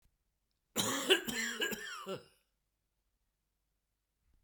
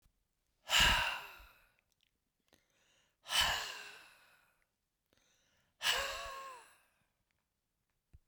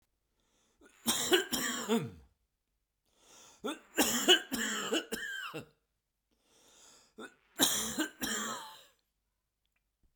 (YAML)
cough_length: 4.4 s
cough_amplitude: 7331
cough_signal_mean_std_ratio: 0.37
exhalation_length: 8.3 s
exhalation_amplitude: 5118
exhalation_signal_mean_std_ratio: 0.33
three_cough_length: 10.2 s
three_cough_amplitude: 10570
three_cough_signal_mean_std_ratio: 0.42
survey_phase: beta (2021-08-13 to 2022-03-07)
age: 45-64
gender: Male
wearing_mask: 'No'
symptom_none: true
smoker_status: Never smoked
respiratory_condition_asthma: false
respiratory_condition_other: false
recruitment_source: REACT
submission_delay: 1 day
covid_test_result: Negative
covid_test_method: RT-qPCR